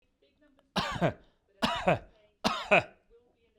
{"three_cough_length": "3.6 s", "three_cough_amplitude": 12585, "three_cough_signal_mean_std_ratio": 0.39, "survey_phase": "beta (2021-08-13 to 2022-03-07)", "age": "45-64", "gender": "Male", "wearing_mask": "No", "symptom_cough_any": true, "smoker_status": "Never smoked", "respiratory_condition_asthma": false, "respiratory_condition_other": false, "recruitment_source": "REACT", "submission_delay": "0 days", "covid_test_result": "Negative", "covid_test_method": "RT-qPCR"}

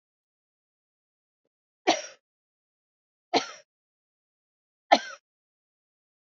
{"three_cough_length": "6.2 s", "three_cough_amplitude": 23278, "three_cough_signal_mean_std_ratio": 0.16, "survey_phase": "alpha (2021-03-01 to 2021-08-12)", "age": "65+", "gender": "Female", "wearing_mask": "No", "symptom_cough_any": true, "symptom_fatigue": true, "symptom_headache": true, "symptom_change_to_sense_of_smell_or_taste": true, "symptom_onset": "3 days", "smoker_status": "Never smoked", "respiratory_condition_asthma": false, "respiratory_condition_other": false, "recruitment_source": "Test and Trace", "submission_delay": "1 day", "covid_test_result": "Positive", "covid_test_method": "RT-qPCR"}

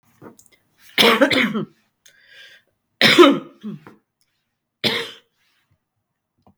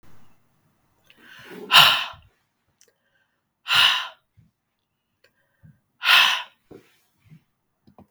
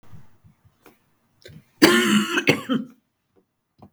{"three_cough_length": "6.6 s", "three_cough_amplitude": 32768, "three_cough_signal_mean_std_ratio": 0.32, "exhalation_length": "8.1 s", "exhalation_amplitude": 32768, "exhalation_signal_mean_std_ratio": 0.28, "cough_length": "3.9 s", "cough_amplitude": 32766, "cough_signal_mean_std_ratio": 0.37, "survey_phase": "beta (2021-08-13 to 2022-03-07)", "age": "45-64", "gender": "Female", "wearing_mask": "No", "symptom_runny_or_blocked_nose": true, "symptom_change_to_sense_of_smell_or_taste": true, "symptom_loss_of_taste": true, "symptom_onset": "2 days", "smoker_status": "Never smoked", "respiratory_condition_asthma": false, "respiratory_condition_other": false, "recruitment_source": "Test and Trace", "submission_delay": "1 day", "covid_test_result": "Positive", "covid_test_method": "RT-qPCR", "covid_ct_value": 17.3, "covid_ct_gene": "ORF1ab gene", "covid_ct_mean": 17.6, "covid_viral_load": "1700000 copies/ml", "covid_viral_load_category": "High viral load (>1M copies/ml)"}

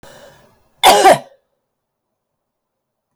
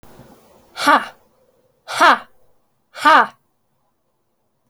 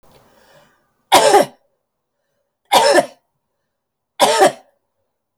{"cough_length": "3.2 s", "cough_amplitude": 32768, "cough_signal_mean_std_ratio": 0.28, "exhalation_length": "4.7 s", "exhalation_amplitude": 30758, "exhalation_signal_mean_std_ratio": 0.3, "three_cough_length": "5.4 s", "three_cough_amplitude": 32768, "three_cough_signal_mean_std_ratio": 0.35, "survey_phase": "alpha (2021-03-01 to 2021-08-12)", "age": "45-64", "gender": "Female", "wearing_mask": "No", "symptom_cough_any": true, "smoker_status": "Never smoked", "respiratory_condition_asthma": true, "respiratory_condition_other": false, "recruitment_source": "Test and Trace", "submission_delay": "2 days", "covid_test_result": "Positive", "covid_test_method": "RT-qPCR", "covid_ct_value": 32.5, "covid_ct_gene": "N gene"}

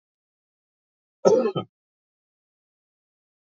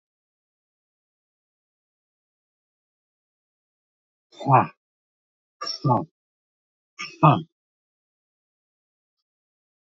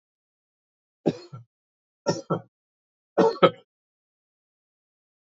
{"cough_length": "3.5 s", "cough_amplitude": 25411, "cough_signal_mean_std_ratio": 0.23, "exhalation_length": "9.9 s", "exhalation_amplitude": 27111, "exhalation_signal_mean_std_ratio": 0.19, "three_cough_length": "5.3 s", "three_cough_amplitude": 26171, "three_cough_signal_mean_std_ratio": 0.22, "survey_phase": "beta (2021-08-13 to 2022-03-07)", "age": "65+", "gender": "Male", "wearing_mask": "No", "symptom_none": true, "smoker_status": "Never smoked", "respiratory_condition_asthma": false, "respiratory_condition_other": false, "recruitment_source": "REACT", "submission_delay": "4 days", "covid_test_result": "Negative", "covid_test_method": "RT-qPCR", "influenza_a_test_result": "Negative", "influenza_b_test_result": "Negative"}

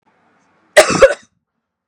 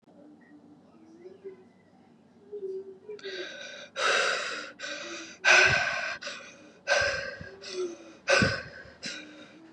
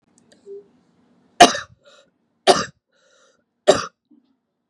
{"cough_length": "1.9 s", "cough_amplitude": 32768, "cough_signal_mean_std_ratio": 0.31, "exhalation_length": "9.7 s", "exhalation_amplitude": 13604, "exhalation_signal_mean_std_ratio": 0.48, "three_cough_length": "4.7 s", "three_cough_amplitude": 32768, "three_cough_signal_mean_std_ratio": 0.21, "survey_phase": "beta (2021-08-13 to 2022-03-07)", "age": "18-44", "gender": "Female", "wearing_mask": "No", "symptom_none": true, "smoker_status": "Current smoker (1 to 10 cigarettes per day)", "respiratory_condition_asthma": false, "respiratory_condition_other": false, "recruitment_source": "REACT", "submission_delay": "2 days", "covid_test_result": "Negative", "covid_test_method": "RT-qPCR", "influenza_a_test_result": "Negative", "influenza_b_test_result": "Negative"}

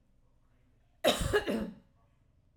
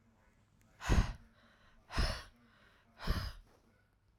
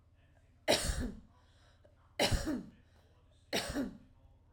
{"cough_length": "2.6 s", "cough_amplitude": 6556, "cough_signal_mean_std_ratio": 0.38, "exhalation_length": "4.2 s", "exhalation_amplitude": 5567, "exhalation_signal_mean_std_ratio": 0.35, "three_cough_length": "4.5 s", "three_cough_amplitude": 6272, "three_cough_signal_mean_std_ratio": 0.44, "survey_phase": "alpha (2021-03-01 to 2021-08-12)", "age": "45-64", "gender": "Female", "wearing_mask": "No", "symptom_none": true, "smoker_status": "Never smoked", "respiratory_condition_asthma": true, "respiratory_condition_other": false, "recruitment_source": "REACT", "submission_delay": "1 day", "covid_test_result": "Negative", "covid_test_method": "RT-qPCR"}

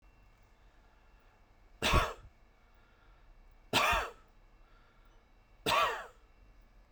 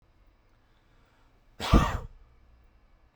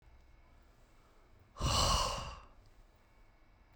{"three_cough_length": "6.9 s", "three_cough_amplitude": 6318, "three_cough_signal_mean_std_ratio": 0.34, "cough_length": "3.2 s", "cough_amplitude": 14661, "cough_signal_mean_std_ratio": 0.25, "exhalation_length": "3.8 s", "exhalation_amplitude": 3692, "exhalation_signal_mean_std_ratio": 0.4, "survey_phase": "beta (2021-08-13 to 2022-03-07)", "age": "18-44", "gender": "Male", "wearing_mask": "No", "symptom_none": true, "symptom_onset": "8 days", "smoker_status": "Ex-smoker", "respiratory_condition_asthma": false, "respiratory_condition_other": false, "recruitment_source": "REACT", "submission_delay": "2 days", "covid_test_result": "Negative", "covid_test_method": "RT-qPCR"}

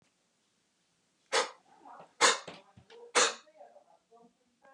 {"exhalation_length": "4.7 s", "exhalation_amplitude": 11416, "exhalation_signal_mean_std_ratio": 0.27, "survey_phase": "beta (2021-08-13 to 2022-03-07)", "age": "45-64", "gender": "Male", "wearing_mask": "No", "symptom_none": true, "smoker_status": "Never smoked", "respiratory_condition_asthma": false, "respiratory_condition_other": false, "recruitment_source": "REACT", "submission_delay": "3 days", "covid_test_result": "Negative", "covid_test_method": "RT-qPCR", "influenza_a_test_result": "Negative", "influenza_b_test_result": "Negative"}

